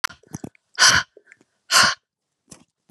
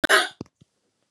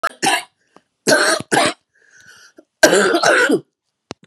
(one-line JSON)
{"exhalation_length": "2.9 s", "exhalation_amplitude": 30041, "exhalation_signal_mean_std_ratio": 0.33, "cough_length": "1.1 s", "cough_amplitude": 21745, "cough_signal_mean_std_ratio": 0.33, "three_cough_length": "4.3 s", "three_cough_amplitude": 32768, "three_cough_signal_mean_std_ratio": 0.5, "survey_phase": "beta (2021-08-13 to 2022-03-07)", "age": "65+", "gender": "Female", "wearing_mask": "No", "symptom_new_continuous_cough": true, "symptom_runny_or_blocked_nose": true, "symptom_sore_throat": true, "symptom_onset": "3 days", "smoker_status": "Never smoked", "respiratory_condition_asthma": false, "respiratory_condition_other": false, "recruitment_source": "Test and Trace", "submission_delay": "1 day", "covid_test_result": "Positive", "covid_test_method": "RT-qPCR", "covid_ct_value": 14.4, "covid_ct_gene": "N gene", "covid_ct_mean": 14.8, "covid_viral_load": "14000000 copies/ml", "covid_viral_load_category": "High viral load (>1M copies/ml)"}